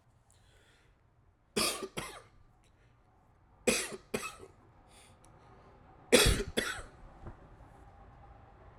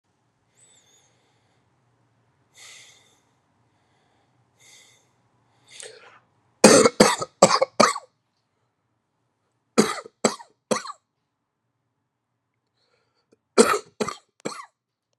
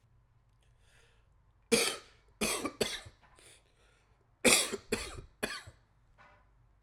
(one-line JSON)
{"three_cough_length": "8.8 s", "three_cough_amplitude": 12544, "three_cough_signal_mean_std_ratio": 0.31, "exhalation_length": "15.2 s", "exhalation_amplitude": 32767, "exhalation_signal_mean_std_ratio": 0.22, "cough_length": "6.8 s", "cough_amplitude": 16515, "cough_signal_mean_std_ratio": 0.33, "survey_phase": "alpha (2021-03-01 to 2021-08-12)", "age": "18-44", "gender": "Male", "wearing_mask": "No", "symptom_cough_any": true, "symptom_new_continuous_cough": true, "symptom_fatigue": true, "symptom_fever_high_temperature": true, "smoker_status": "Ex-smoker", "respiratory_condition_asthma": false, "respiratory_condition_other": false, "recruitment_source": "Test and Trace", "submission_delay": "0 days", "covid_test_result": "Positive", "covid_test_method": "LFT"}